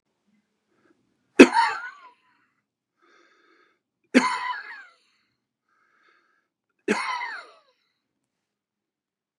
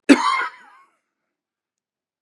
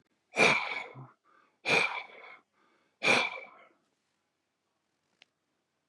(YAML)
three_cough_length: 9.4 s
three_cough_amplitude: 32768
three_cough_signal_mean_std_ratio: 0.2
cough_length: 2.2 s
cough_amplitude: 32768
cough_signal_mean_std_ratio: 0.28
exhalation_length: 5.9 s
exhalation_amplitude: 11831
exhalation_signal_mean_std_ratio: 0.34
survey_phase: beta (2021-08-13 to 2022-03-07)
age: 65+
gender: Male
wearing_mask: 'No'
symptom_none: true
smoker_status: Never smoked
respiratory_condition_asthma: false
respiratory_condition_other: false
recruitment_source: REACT
submission_delay: 2 days
covid_test_result: Negative
covid_test_method: RT-qPCR
influenza_a_test_result: Negative
influenza_b_test_result: Negative